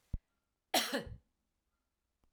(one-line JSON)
{"cough_length": "2.3 s", "cough_amplitude": 4327, "cough_signal_mean_std_ratio": 0.29, "survey_phase": "alpha (2021-03-01 to 2021-08-12)", "age": "65+", "gender": "Female", "wearing_mask": "No", "symptom_headache": true, "symptom_change_to_sense_of_smell_or_taste": true, "symptom_loss_of_taste": true, "symptom_onset": "5 days", "smoker_status": "Never smoked", "respiratory_condition_asthma": false, "respiratory_condition_other": false, "recruitment_source": "Test and Trace", "submission_delay": "2 days", "covid_test_result": "Positive", "covid_test_method": "RT-qPCR"}